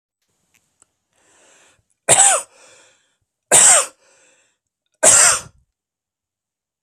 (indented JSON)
{
  "three_cough_length": "6.8 s",
  "three_cough_amplitude": 32768,
  "three_cough_signal_mean_std_ratio": 0.31,
  "survey_phase": "alpha (2021-03-01 to 2021-08-12)",
  "age": "45-64",
  "gender": "Male",
  "wearing_mask": "No",
  "symptom_none": true,
  "smoker_status": "Never smoked",
  "respiratory_condition_asthma": false,
  "respiratory_condition_other": false,
  "recruitment_source": "REACT",
  "submission_delay": "1 day",
  "covid_test_result": "Negative",
  "covid_test_method": "RT-qPCR"
}